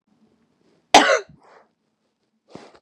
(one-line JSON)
{"cough_length": "2.8 s", "cough_amplitude": 32768, "cough_signal_mean_std_ratio": 0.23, "survey_phase": "beta (2021-08-13 to 2022-03-07)", "age": "18-44", "gender": "Female", "wearing_mask": "No", "symptom_runny_or_blocked_nose": true, "smoker_status": "Never smoked", "respiratory_condition_asthma": false, "respiratory_condition_other": false, "recruitment_source": "REACT", "submission_delay": "1 day", "covid_test_result": "Negative", "covid_test_method": "RT-qPCR", "influenza_a_test_result": "Negative", "influenza_b_test_result": "Negative"}